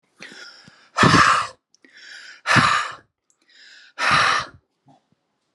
{"exhalation_length": "5.5 s", "exhalation_amplitude": 30414, "exhalation_signal_mean_std_ratio": 0.42, "survey_phase": "alpha (2021-03-01 to 2021-08-12)", "age": "45-64", "gender": "Male", "wearing_mask": "No", "symptom_cough_any": true, "smoker_status": "Never smoked", "respiratory_condition_asthma": true, "respiratory_condition_other": false, "recruitment_source": "REACT", "submission_delay": "2 days", "covid_test_result": "Negative", "covid_test_method": "RT-qPCR"}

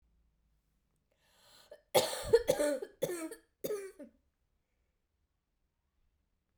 {"cough_length": "6.6 s", "cough_amplitude": 9048, "cough_signal_mean_std_ratio": 0.3, "survey_phase": "beta (2021-08-13 to 2022-03-07)", "age": "45-64", "gender": "Female", "wearing_mask": "No", "symptom_cough_any": true, "symptom_runny_or_blocked_nose": true, "symptom_fatigue": true, "symptom_fever_high_temperature": true, "symptom_headache": true, "symptom_onset": "3 days", "smoker_status": "Never smoked", "respiratory_condition_asthma": true, "respiratory_condition_other": false, "recruitment_source": "Test and Trace", "submission_delay": "1 day", "covid_test_result": "Positive", "covid_test_method": "ePCR"}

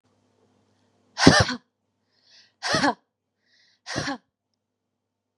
{"exhalation_length": "5.4 s", "exhalation_amplitude": 32767, "exhalation_signal_mean_std_ratio": 0.26, "survey_phase": "beta (2021-08-13 to 2022-03-07)", "age": "18-44", "gender": "Female", "wearing_mask": "No", "symptom_none": true, "smoker_status": "Never smoked", "respiratory_condition_asthma": true, "respiratory_condition_other": false, "recruitment_source": "REACT", "submission_delay": "1 day", "covid_test_result": "Negative", "covid_test_method": "RT-qPCR", "influenza_a_test_result": "Unknown/Void", "influenza_b_test_result": "Unknown/Void"}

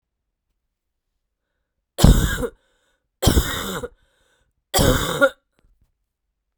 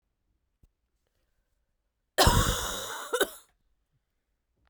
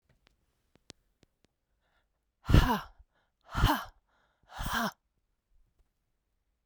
{"three_cough_length": "6.6 s", "three_cough_amplitude": 32768, "three_cough_signal_mean_std_ratio": 0.34, "cough_length": "4.7 s", "cough_amplitude": 14742, "cough_signal_mean_std_ratio": 0.31, "exhalation_length": "6.7 s", "exhalation_amplitude": 14681, "exhalation_signal_mean_std_ratio": 0.25, "survey_phase": "beta (2021-08-13 to 2022-03-07)", "age": "18-44", "gender": "Female", "wearing_mask": "No", "symptom_cough_any": true, "symptom_new_continuous_cough": true, "symptom_runny_or_blocked_nose": true, "symptom_shortness_of_breath": true, "symptom_sore_throat": true, "symptom_abdominal_pain": true, "symptom_fatigue": true, "symptom_headache": true, "symptom_onset": "3 days", "smoker_status": "Ex-smoker", "respiratory_condition_asthma": false, "respiratory_condition_other": false, "recruitment_source": "Test and Trace", "submission_delay": "1 day", "covid_test_result": "Positive", "covid_test_method": "RT-qPCR", "covid_ct_value": 22.7, "covid_ct_gene": "N gene"}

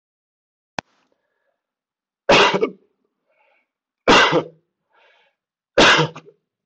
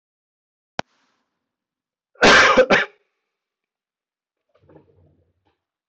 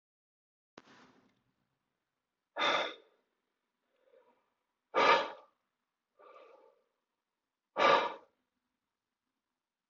{"three_cough_length": "6.7 s", "three_cough_amplitude": 18330, "three_cough_signal_mean_std_ratio": 0.33, "cough_length": "5.9 s", "cough_amplitude": 18030, "cough_signal_mean_std_ratio": 0.27, "exhalation_length": "9.9 s", "exhalation_amplitude": 7251, "exhalation_signal_mean_std_ratio": 0.25, "survey_phase": "beta (2021-08-13 to 2022-03-07)", "age": "18-44", "gender": "Male", "wearing_mask": "No", "symptom_runny_or_blocked_nose": true, "symptom_sore_throat": true, "symptom_fatigue": true, "symptom_headache": true, "symptom_change_to_sense_of_smell_or_taste": true, "symptom_onset": "5 days", "smoker_status": "Never smoked", "respiratory_condition_asthma": false, "respiratory_condition_other": false, "recruitment_source": "Test and Trace", "submission_delay": "2 days", "covid_test_result": "Positive", "covid_test_method": "LAMP"}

